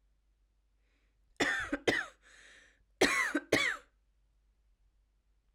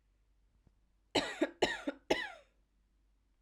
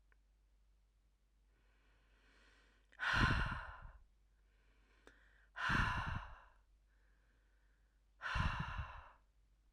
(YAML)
cough_length: 5.5 s
cough_amplitude: 8210
cough_signal_mean_std_ratio: 0.36
three_cough_length: 3.4 s
three_cough_amplitude: 5154
three_cough_signal_mean_std_ratio: 0.33
exhalation_length: 9.7 s
exhalation_amplitude: 3271
exhalation_signal_mean_std_ratio: 0.39
survey_phase: alpha (2021-03-01 to 2021-08-12)
age: 18-44
gender: Female
wearing_mask: 'No'
symptom_headache: true
smoker_status: Never smoked
respiratory_condition_asthma: false
respiratory_condition_other: false
recruitment_source: Test and Trace
submission_delay: 2 days
covid_test_result: Positive
covid_test_method: RT-qPCR
covid_ct_value: 34.3
covid_ct_gene: N gene